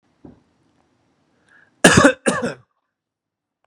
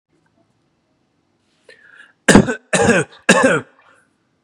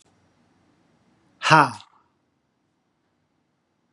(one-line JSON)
{"cough_length": "3.7 s", "cough_amplitude": 32768, "cough_signal_mean_std_ratio": 0.27, "three_cough_length": "4.4 s", "three_cough_amplitude": 32768, "three_cough_signal_mean_std_ratio": 0.34, "exhalation_length": "3.9 s", "exhalation_amplitude": 31149, "exhalation_signal_mean_std_ratio": 0.19, "survey_phase": "beta (2021-08-13 to 2022-03-07)", "age": "18-44", "gender": "Male", "wearing_mask": "No", "symptom_none": true, "smoker_status": "Never smoked", "respiratory_condition_asthma": false, "respiratory_condition_other": false, "recruitment_source": "REACT", "submission_delay": "1 day", "covid_test_result": "Negative", "covid_test_method": "RT-qPCR", "influenza_a_test_result": "Negative", "influenza_b_test_result": "Negative"}